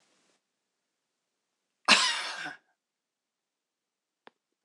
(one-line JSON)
{"cough_length": "4.6 s", "cough_amplitude": 21687, "cough_signal_mean_std_ratio": 0.22, "survey_phase": "beta (2021-08-13 to 2022-03-07)", "age": "65+", "gender": "Female", "wearing_mask": "No", "symptom_cough_any": true, "symptom_runny_or_blocked_nose": true, "smoker_status": "Never smoked", "respiratory_condition_asthma": false, "respiratory_condition_other": false, "recruitment_source": "REACT", "submission_delay": "0 days", "covid_test_result": "Negative", "covid_test_method": "RT-qPCR"}